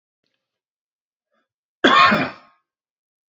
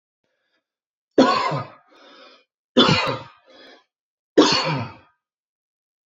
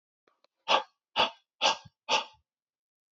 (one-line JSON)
{"cough_length": "3.3 s", "cough_amplitude": 27613, "cough_signal_mean_std_ratio": 0.29, "three_cough_length": "6.1 s", "three_cough_amplitude": 27138, "three_cough_signal_mean_std_ratio": 0.35, "exhalation_length": "3.2 s", "exhalation_amplitude": 9418, "exhalation_signal_mean_std_ratio": 0.32, "survey_phase": "beta (2021-08-13 to 2022-03-07)", "age": "18-44", "gender": "Male", "wearing_mask": "No", "symptom_runny_or_blocked_nose": true, "symptom_sore_throat": true, "symptom_fatigue": true, "smoker_status": "Ex-smoker", "respiratory_condition_asthma": false, "respiratory_condition_other": false, "recruitment_source": "Test and Trace", "submission_delay": "2 days", "covid_test_result": "Positive", "covid_test_method": "RT-qPCR"}